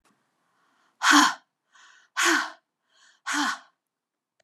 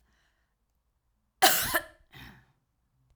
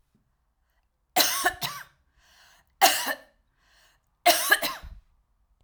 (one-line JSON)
{"exhalation_length": "4.4 s", "exhalation_amplitude": 21170, "exhalation_signal_mean_std_ratio": 0.34, "cough_length": "3.2 s", "cough_amplitude": 15195, "cough_signal_mean_std_ratio": 0.26, "three_cough_length": "5.6 s", "three_cough_amplitude": 20874, "three_cough_signal_mean_std_ratio": 0.34, "survey_phase": "alpha (2021-03-01 to 2021-08-12)", "age": "45-64", "gender": "Female", "wearing_mask": "No", "symptom_loss_of_taste": true, "symptom_onset": "12 days", "smoker_status": "Never smoked", "respiratory_condition_asthma": false, "respiratory_condition_other": false, "recruitment_source": "REACT", "submission_delay": "1 day", "covid_test_result": "Negative", "covid_test_method": "RT-qPCR"}